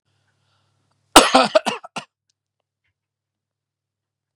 cough_length: 4.4 s
cough_amplitude: 32768
cough_signal_mean_std_ratio: 0.21
survey_phase: beta (2021-08-13 to 2022-03-07)
age: 45-64
gender: Male
wearing_mask: 'No'
symptom_shortness_of_breath: true
symptom_fatigue: true
smoker_status: Ex-smoker
respiratory_condition_asthma: false
respiratory_condition_other: false
recruitment_source: REACT
submission_delay: 11 days
covid_test_result: Negative
covid_test_method: RT-qPCR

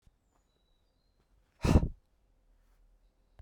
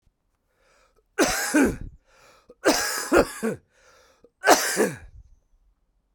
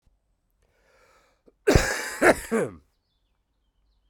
exhalation_length: 3.4 s
exhalation_amplitude: 8785
exhalation_signal_mean_std_ratio: 0.2
three_cough_length: 6.1 s
three_cough_amplitude: 32767
three_cough_signal_mean_std_ratio: 0.41
cough_length: 4.1 s
cough_amplitude: 23460
cough_signal_mean_std_ratio: 0.3
survey_phase: beta (2021-08-13 to 2022-03-07)
age: 45-64
gender: Male
wearing_mask: 'No'
symptom_cough_any: true
symptom_runny_or_blocked_nose: true
symptom_shortness_of_breath: true
symptom_fatigue: true
symptom_headache: true
symptom_change_to_sense_of_smell_or_taste: true
symptom_loss_of_taste: true
symptom_onset: 6 days
smoker_status: Never smoked
respiratory_condition_asthma: false
respiratory_condition_other: false
recruitment_source: Test and Trace
submission_delay: 1 day
covid_test_result: Positive
covid_test_method: RT-qPCR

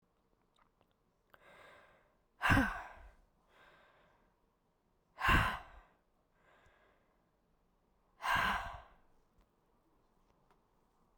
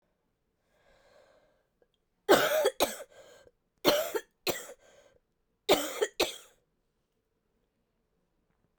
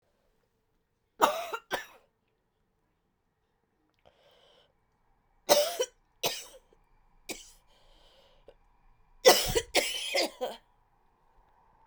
exhalation_length: 11.2 s
exhalation_amplitude: 5384
exhalation_signal_mean_std_ratio: 0.27
cough_length: 8.8 s
cough_amplitude: 13615
cough_signal_mean_std_ratio: 0.3
three_cough_length: 11.9 s
three_cough_amplitude: 19407
three_cough_signal_mean_std_ratio: 0.27
survey_phase: beta (2021-08-13 to 2022-03-07)
age: 18-44
gender: Female
wearing_mask: 'No'
symptom_new_continuous_cough: true
symptom_runny_or_blocked_nose: true
symptom_sore_throat: true
symptom_headache: true
symptom_onset: 3 days
smoker_status: Never smoked
respiratory_condition_asthma: true
respiratory_condition_other: false
recruitment_source: Test and Trace
submission_delay: 2 days
covid_test_result: Positive
covid_test_method: RT-qPCR
covid_ct_value: 19.5
covid_ct_gene: ORF1ab gene
covid_ct_mean: 20.5
covid_viral_load: 190000 copies/ml
covid_viral_load_category: Low viral load (10K-1M copies/ml)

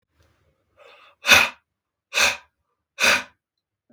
exhalation_length: 3.9 s
exhalation_amplitude: 32767
exhalation_signal_mean_std_ratio: 0.31
survey_phase: beta (2021-08-13 to 2022-03-07)
age: 45-64
gender: Male
wearing_mask: 'No'
symptom_none: true
smoker_status: Never smoked
respiratory_condition_asthma: false
respiratory_condition_other: false
recruitment_source: REACT
submission_delay: 3 days
covid_test_result: Negative
covid_test_method: RT-qPCR
influenza_a_test_result: Negative
influenza_b_test_result: Negative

